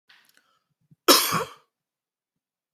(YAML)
cough_length: 2.7 s
cough_amplitude: 25866
cough_signal_mean_std_ratio: 0.25
survey_phase: beta (2021-08-13 to 2022-03-07)
age: 45-64
gender: Male
wearing_mask: 'No'
symptom_none: true
smoker_status: Never smoked
respiratory_condition_asthma: false
respiratory_condition_other: false
recruitment_source: REACT
submission_delay: 2 days
covid_test_result: Negative
covid_test_method: RT-qPCR